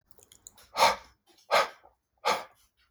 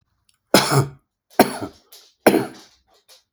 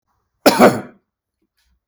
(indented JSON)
{
  "exhalation_length": "2.9 s",
  "exhalation_amplitude": 13726,
  "exhalation_signal_mean_std_ratio": 0.33,
  "three_cough_length": "3.3 s",
  "three_cough_amplitude": 32768,
  "three_cough_signal_mean_std_ratio": 0.32,
  "cough_length": "1.9 s",
  "cough_amplitude": 32768,
  "cough_signal_mean_std_ratio": 0.3,
  "survey_phase": "beta (2021-08-13 to 2022-03-07)",
  "age": "45-64",
  "gender": "Male",
  "wearing_mask": "No",
  "symptom_runny_or_blocked_nose": true,
  "symptom_headache": true,
  "symptom_onset": "12 days",
  "smoker_status": "Ex-smoker",
  "respiratory_condition_asthma": false,
  "respiratory_condition_other": true,
  "recruitment_source": "REACT",
  "submission_delay": "2 days",
  "covid_test_result": "Negative",
  "covid_test_method": "RT-qPCR",
  "influenza_a_test_result": "Negative",
  "influenza_b_test_result": "Negative"
}